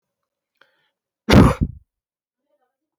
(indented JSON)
{
  "cough_length": "3.0 s",
  "cough_amplitude": 27603,
  "cough_signal_mean_std_ratio": 0.24,
  "survey_phase": "beta (2021-08-13 to 2022-03-07)",
  "age": "65+",
  "gender": "Male",
  "wearing_mask": "No",
  "symptom_none": true,
  "smoker_status": "Ex-smoker",
  "respiratory_condition_asthma": false,
  "respiratory_condition_other": false,
  "recruitment_source": "REACT",
  "submission_delay": "0 days",
  "covid_test_result": "Negative",
  "covid_test_method": "RT-qPCR"
}